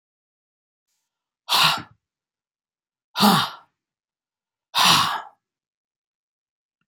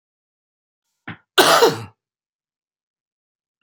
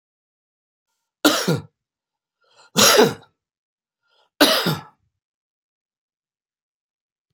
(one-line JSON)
{"exhalation_length": "6.9 s", "exhalation_amplitude": 27080, "exhalation_signal_mean_std_ratio": 0.31, "cough_length": "3.6 s", "cough_amplitude": 30201, "cough_signal_mean_std_ratio": 0.26, "three_cough_length": "7.3 s", "three_cough_amplitude": 31527, "three_cough_signal_mean_std_ratio": 0.28, "survey_phase": "beta (2021-08-13 to 2022-03-07)", "age": "65+", "gender": "Male", "wearing_mask": "No", "symptom_cough_any": true, "symptom_runny_or_blocked_nose": true, "symptom_fatigue": true, "symptom_change_to_sense_of_smell_or_taste": true, "symptom_onset": "4 days", "smoker_status": "Ex-smoker", "respiratory_condition_asthma": true, "respiratory_condition_other": false, "recruitment_source": "Test and Trace", "submission_delay": "2 days", "covid_test_result": "Positive", "covid_test_method": "ePCR"}